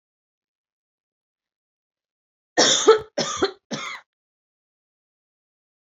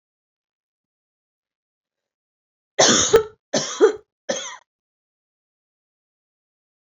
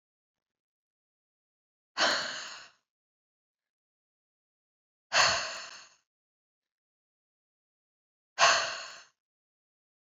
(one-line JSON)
{"cough_length": "5.9 s", "cough_amplitude": 26079, "cough_signal_mean_std_ratio": 0.26, "three_cough_length": "6.8 s", "three_cough_amplitude": 27720, "three_cough_signal_mean_std_ratio": 0.26, "exhalation_length": "10.2 s", "exhalation_amplitude": 12275, "exhalation_signal_mean_std_ratio": 0.26, "survey_phase": "alpha (2021-03-01 to 2021-08-12)", "age": "18-44", "gender": "Female", "wearing_mask": "No", "symptom_none": true, "smoker_status": "Never smoked", "respiratory_condition_asthma": true, "respiratory_condition_other": false, "recruitment_source": "REACT", "submission_delay": "1 day", "covid_test_result": "Negative", "covid_test_method": "RT-qPCR"}